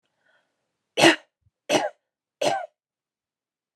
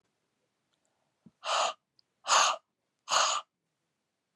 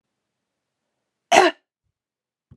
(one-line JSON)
{"three_cough_length": "3.8 s", "three_cough_amplitude": 27986, "three_cough_signal_mean_std_ratio": 0.27, "exhalation_length": "4.4 s", "exhalation_amplitude": 9892, "exhalation_signal_mean_std_ratio": 0.35, "cough_length": "2.6 s", "cough_amplitude": 31412, "cough_signal_mean_std_ratio": 0.21, "survey_phase": "beta (2021-08-13 to 2022-03-07)", "age": "45-64", "gender": "Female", "wearing_mask": "No", "symptom_runny_or_blocked_nose": true, "symptom_shortness_of_breath": true, "smoker_status": "Never smoked", "respiratory_condition_asthma": false, "respiratory_condition_other": false, "recruitment_source": "Test and Trace", "submission_delay": "2 days", "covid_test_result": "Positive", "covid_test_method": "RT-qPCR"}